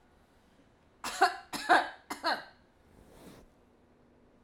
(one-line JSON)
{"three_cough_length": "4.4 s", "three_cough_amplitude": 9864, "three_cough_signal_mean_std_ratio": 0.31, "survey_phase": "alpha (2021-03-01 to 2021-08-12)", "age": "45-64", "gender": "Female", "wearing_mask": "No", "symptom_none": true, "smoker_status": "Never smoked", "respiratory_condition_asthma": false, "respiratory_condition_other": false, "recruitment_source": "REACT", "submission_delay": "2 days", "covid_test_result": "Negative", "covid_test_method": "RT-qPCR"}